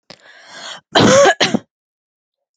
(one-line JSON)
{"cough_length": "2.6 s", "cough_amplitude": 32768, "cough_signal_mean_std_ratio": 0.41, "survey_phase": "beta (2021-08-13 to 2022-03-07)", "age": "18-44", "gender": "Female", "wearing_mask": "No", "symptom_cough_any": true, "symptom_runny_or_blocked_nose": true, "symptom_sore_throat": true, "symptom_onset": "5 days", "smoker_status": "Never smoked", "respiratory_condition_asthma": false, "respiratory_condition_other": false, "recruitment_source": "REACT", "submission_delay": "1 day", "covid_test_result": "Negative", "covid_test_method": "RT-qPCR", "influenza_a_test_result": "Unknown/Void", "influenza_b_test_result": "Unknown/Void"}